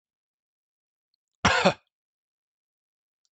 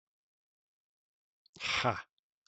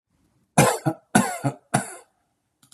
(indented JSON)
{
  "cough_length": "3.3 s",
  "cough_amplitude": 17719,
  "cough_signal_mean_std_ratio": 0.21,
  "exhalation_length": "2.5 s",
  "exhalation_amplitude": 5592,
  "exhalation_signal_mean_std_ratio": 0.29,
  "three_cough_length": "2.7 s",
  "three_cough_amplitude": 30234,
  "three_cough_signal_mean_std_ratio": 0.36,
  "survey_phase": "beta (2021-08-13 to 2022-03-07)",
  "age": "45-64",
  "gender": "Male",
  "wearing_mask": "No",
  "symptom_fatigue": true,
  "symptom_onset": "12 days",
  "smoker_status": "Never smoked",
  "respiratory_condition_asthma": false,
  "respiratory_condition_other": false,
  "recruitment_source": "REACT",
  "submission_delay": "1 day",
  "covid_test_result": "Negative",
  "covid_test_method": "RT-qPCR",
  "influenza_a_test_result": "Negative",
  "influenza_b_test_result": "Negative"
}